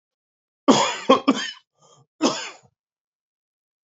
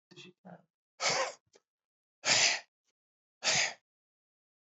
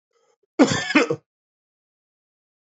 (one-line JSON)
{"three_cough_length": "3.8 s", "three_cough_amplitude": 27405, "three_cough_signal_mean_std_ratio": 0.32, "exhalation_length": "4.8 s", "exhalation_amplitude": 7688, "exhalation_signal_mean_std_ratio": 0.36, "cough_length": "2.7 s", "cough_amplitude": 27777, "cough_signal_mean_std_ratio": 0.29, "survey_phase": "beta (2021-08-13 to 2022-03-07)", "age": "45-64", "gender": "Male", "wearing_mask": "Yes", "symptom_cough_any": true, "symptom_runny_or_blocked_nose": true, "symptom_sore_throat": true, "symptom_fatigue": true, "symptom_fever_high_temperature": true, "symptom_headache": true, "symptom_change_to_sense_of_smell_or_taste": true, "symptom_onset": "2 days", "smoker_status": "Never smoked", "respiratory_condition_asthma": false, "respiratory_condition_other": false, "recruitment_source": "Test and Trace", "submission_delay": "1 day", "covid_test_result": "Positive", "covid_test_method": "RT-qPCR", "covid_ct_value": 21.1, "covid_ct_gene": "ORF1ab gene", "covid_ct_mean": 21.6, "covid_viral_load": "83000 copies/ml", "covid_viral_load_category": "Low viral load (10K-1M copies/ml)"}